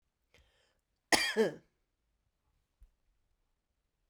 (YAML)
cough_length: 4.1 s
cough_amplitude: 11214
cough_signal_mean_std_ratio: 0.22
survey_phase: beta (2021-08-13 to 2022-03-07)
age: 45-64
gender: Female
wearing_mask: 'No'
symptom_cough_any: true
symptom_runny_or_blocked_nose: true
symptom_shortness_of_breath: true
symptom_headache: true
symptom_change_to_sense_of_smell_or_taste: true
symptom_loss_of_taste: true
symptom_onset: 2 days
smoker_status: Never smoked
respiratory_condition_asthma: false
respiratory_condition_other: false
recruitment_source: Test and Trace
submission_delay: 1 day
covid_test_result: Positive
covid_test_method: RT-qPCR